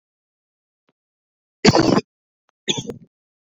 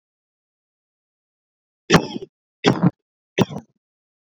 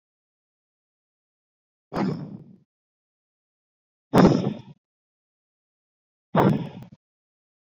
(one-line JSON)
{"cough_length": "3.5 s", "cough_amplitude": 27579, "cough_signal_mean_std_ratio": 0.27, "three_cough_length": "4.3 s", "three_cough_amplitude": 29984, "three_cough_signal_mean_std_ratio": 0.25, "exhalation_length": "7.7 s", "exhalation_amplitude": 25093, "exhalation_signal_mean_std_ratio": 0.26, "survey_phase": "beta (2021-08-13 to 2022-03-07)", "age": "18-44", "gender": "Male", "wearing_mask": "No", "symptom_abdominal_pain": true, "symptom_diarrhoea": true, "symptom_fatigue": true, "smoker_status": "Never smoked", "respiratory_condition_asthma": false, "respiratory_condition_other": false, "recruitment_source": "REACT", "submission_delay": "7 days", "covid_test_result": "Negative", "covid_test_method": "RT-qPCR"}